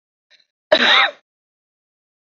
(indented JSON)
{
  "cough_length": "2.3 s",
  "cough_amplitude": 30924,
  "cough_signal_mean_std_ratio": 0.32,
  "survey_phase": "beta (2021-08-13 to 2022-03-07)",
  "age": "45-64",
  "gender": "Female",
  "wearing_mask": "No",
  "symptom_none": true,
  "smoker_status": "Never smoked",
  "respiratory_condition_asthma": false,
  "respiratory_condition_other": false,
  "recruitment_source": "REACT",
  "submission_delay": "2 days",
  "covid_test_result": "Negative",
  "covid_test_method": "RT-qPCR",
  "influenza_a_test_result": "Negative",
  "influenza_b_test_result": "Negative"
}